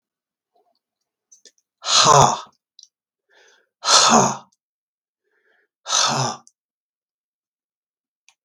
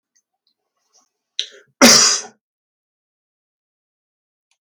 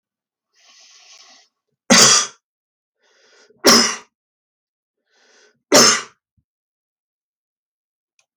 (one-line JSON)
{"exhalation_length": "8.4 s", "exhalation_amplitude": 32768, "exhalation_signal_mean_std_ratio": 0.31, "cough_length": "4.6 s", "cough_amplitude": 32768, "cough_signal_mean_std_ratio": 0.23, "three_cough_length": "8.4 s", "three_cough_amplitude": 32768, "three_cough_signal_mean_std_ratio": 0.27, "survey_phase": "beta (2021-08-13 to 2022-03-07)", "age": "65+", "gender": "Male", "wearing_mask": "No", "symptom_cough_any": true, "smoker_status": "Ex-smoker", "respiratory_condition_asthma": false, "respiratory_condition_other": false, "recruitment_source": "REACT", "submission_delay": "1 day", "covid_test_result": "Negative", "covid_test_method": "RT-qPCR", "influenza_a_test_result": "Negative", "influenza_b_test_result": "Negative"}